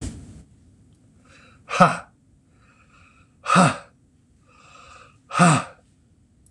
{"exhalation_length": "6.5 s", "exhalation_amplitude": 26027, "exhalation_signal_mean_std_ratio": 0.3, "survey_phase": "beta (2021-08-13 to 2022-03-07)", "age": "65+", "gender": "Male", "wearing_mask": "No", "symptom_none": true, "smoker_status": "Never smoked", "respiratory_condition_asthma": true, "respiratory_condition_other": false, "recruitment_source": "REACT", "submission_delay": "1 day", "covid_test_result": "Negative", "covid_test_method": "RT-qPCR", "influenza_a_test_result": "Negative", "influenza_b_test_result": "Negative"}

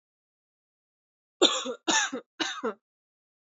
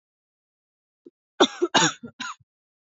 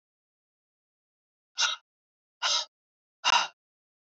{"three_cough_length": "3.4 s", "three_cough_amplitude": 14610, "three_cough_signal_mean_std_ratio": 0.35, "cough_length": "2.9 s", "cough_amplitude": 25421, "cough_signal_mean_std_ratio": 0.27, "exhalation_length": "4.2 s", "exhalation_amplitude": 9319, "exhalation_signal_mean_std_ratio": 0.28, "survey_phase": "beta (2021-08-13 to 2022-03-07)", "age": "18-44", "gender": "Female", "wearing_mask": "No", "symptom_cough_any": true, "symptom_runny_or_blocked_nose": true, "symptom_shortness_of_breath": true, "symptom_fatigue": true, "symptom_headache": true, "smoker_status": "Never smoked", "respiratory_condition_asthma": false, "respiratory_condition_other": false, "recruitment_source": "Test and Trace", "submission_delay": "2 days", "covid_test_result": "Positive", "covid_test_method": "RT-qPCR", "covid_ct_value": 14.8, "covid_ct_gene": "ORF1ab gene", "covid_ct_mean": 15.2, "covid_viral_load": "10000000 copies/ml", "covid_viral_load_category": "High viral load (>1M copies/ml)"}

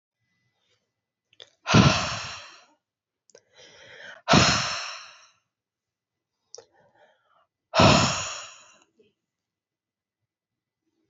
{"exhalation_length": "11.1 s", "exhalation_amplitude": 22373, "exhalation_signal_mean_std_ratio": 0.29, "survey_phase": "alpha (2021-03-01 to 2021-08-12)", "age": "18-44", "gender": "Female", "wearing_mask": "No", "symptom_fatigue": true, "symptom_headache": true, "symptom_change_to_sense_of_smell_or_taste": true, "symptom_loss_of_taste": true, "symptom_onset": "3 days", "smoker_status": "Never smoked", "respiratory_condition_asthma": false, "respiratory_condition_other": false, "recruitment_source": "Test and Trace", "submission_delay": "2 days", "covid_test_result": "Positive", "covid_test_method": "RT-qPCR", "covid_ct_value": 18.9, "covid_ct_gene": "ORF1ab gene", "covid_ct_mean": 19.0, "covid_viral_load": "570000 copies/ml", "covid_viral_load_category": "Low viral load (10K-1M copies/ml)"}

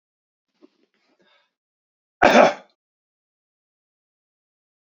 {"cough_length": "4.9 s", "cough_amplitude": 27410, "cough_signal_mean_std_ratio": 0.19, "survey_phase": "beta (2021-08-13 to 2022-03-07)", "age": "45-64", "gender": "Male", "wearing_mask": "No", "symptom_shortness_of_breath": true, "symptom_fatigue": true, "symptom_headache": true, "symptom_other": true, "smoker_status": "Never smoked", "respiratory_condition_asthma": false, "respiratory_condition_other": false, "recruitment_source": "Test and Trace", "submission_delay": "2 days", "covid_test_result": "Positive", "covid_test_method": "RT-qPCR", "covid_ct_value": 31.6, "covid_ct_gene": "N gene", "covid_ct_mean": 31.7, "covid_viral_load": "39 copies/ml", "covid_viral_load_category": "Minimal viral load (< 10K copies/ml)"}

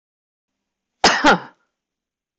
{"cough_length": "2.4 s", "cough_amplitude": 23611, "cough_signal_mean_std_ratio": 0.3, "survey_phase": "beta (2021-08-13 to 2022-03-07)", "age": "65+", "gender": "Female", "wearing_mask": "No", "symptom_none": true, "smoker_status": "Never smoked", "respiratory_condition_asthma": true, "respiratory_condition_other": false, "recruitment_source": "REACT", "submission_delay": "7 days", "covid_test_result": "Negative", "covid_test_method": "RT-qPCR", "influenza_a_test_result": "Negative", "influenza_b_test_result": "Negative"}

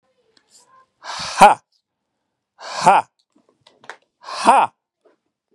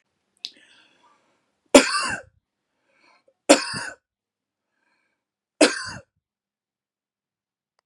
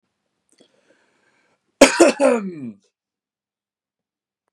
{"exhalation_length": "5.5 s", "exhalation_amplitude": 32768, "exhalation_signal_mean_std_ratio": 0.28, "three_cough_length": "7.9 s", "three_cough_amplitude": 32767, "three_cough_signal_mean_std_ratio": 0.2, "cough_length": "4.5 s", "cough_amplitude": 32768, "cough_signal_mean_std_ratio": 0.26, "survey_phase": "beta (2021-08-13 to 2022-03-07)", "age": "18-44", "gender": "Male", "wearing_mask": "No", "symptom_none": true, "smoker_status": "Ex-smoker", "respiratory_condition_asthma": false, "respiratory_condition_other": false, "recruitment_source": "REACT", "submission_delay": "1 day", "covid_test_result": "Negative", "covid_test_method": "RT-qPCR", "influenza_a_test_result": "Negative", "influenza_b_test_result": "Negative"}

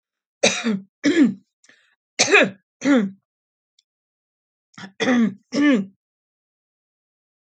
{"three_cough_length": "7.5 s", "three_cough_amplitude": 29107, "three_cough_signal_mean_std_ratio": 0.4, "survey_phase": "alpha (2021-03-01 to 2021-08-12)", "age": "45-64", "gender": "Female", "wearing_mask": "No", "symptom_none": true, "smoker_status": "Never smoked", "respiratory_condition_asthma": false, "respiratory_condition_other": false, "recruitment_source": "REACT", "submission_delay": "1 day", "covid_test_result": "Negative", "covid_test_method": "RT-qPCR"}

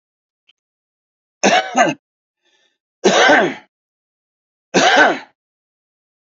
{"three_cough_length": "6.2 s", "three_cough_amplitude": 29672, "three_cough_signal_mean_std_ratio": 0.38, "survey_phase": "beta (2021-08-13 to 2022-03-07)", "age": "45-64", "gender": "Male", "wearing_mask": "No", "symptom_cough_any": true, "symptom_shortness_of_breath": true, "symptom_fatigue": true, "symptom_fever_high_temperature": true, "symptom_headache": true, "symptom_change_to_sense_of_smell_or_taste": true, "symptom_loss_of_taste": true, "symptom_onset": "8 days", "smoker_status": "Ex-smoker", "respiratory_condition_asthma": false, "respiratory_condition_other": false, "recruitment_source": "Test and Trace", "submission_delay": "1 day", "covid_test_result": "Positive", "covid_test_method": "RT-qPCR"}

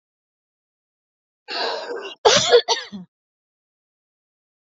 {"cough_length": "4.6 s", "cough_amplitude": 27803, "cough_signal_mean_std_ratio": 0.31, "survey_phase": "beta (2021-08-13 to 2022-03-07)", "age": "45-64", "gender": "Female", "wearing_mask": "No", "symptom_cough_any": true, "symptom_diarrhoea": true, "symptom_fatigue": true, "smoker_status": "Never smoked", "respiratory_condition_asthma": true, "respiratory_condition_other": false, "recruitment_source": "REACT", "submission_delay": "1 day", "covid_test_result": "Negative", "covid_test_method": "RT-qPCR", "influenza_a_test_result": "Negative", "influenza_b_test_result": "Negative"}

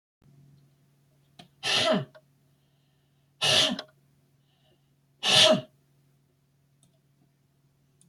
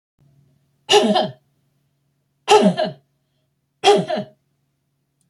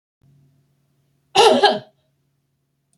{"exhalation_length": "8.1 s", "exhalation_amplitude": 16833, "exhalation_signal_mean_std_ratio": 0.3, "three_cough_length": "5.3 s", "three_cough_amplitude": 29619, "three_cough_signal_mean_std_ratio": 0.35, "cough_length": "3.0 s", "cough_amplitude": 28333, "cough_signal_mean_std_ratio": 0.29, "survey_phase": "beta (2021-08-13 to 2022-03-07)", "age": "45-64", "gender": "Female", "wearing_mask": "No", "symptom_none": true, "smoker_status": "Never smoked", "respiratory_condition_asthma": false, "respiratory_condition_other": false, "recruitment_source": "REACT", "submission_delay": "2 days", "covid_test_result": "Negative", "covid_test_method": "RT-qPCR"}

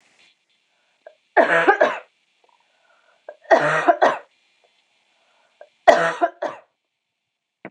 {"three_cough_length": "7.7 s", "three_cough_amplitude": 26028, "three_cough_signal_mean_std_ratio": 0.33, "survey_phase": "beta (2021-08-13 to 2022-03-07)", "age": "18-44", "gender": "Female", "wearing_mask": "No", "symptom_cough_any": true, "symptom_runny_or_blocked_nose": true, "symptom_sore_throat": true, "smoker_status": "Never smoked", "respiratory_condition_asthma": false, "respiratory_condition_other": false, "recruitment_source": "Test and Trace", "submission_delay": "1 day", "covid_test_result": "Positive", "covid_test_method": "RT-qPCR"}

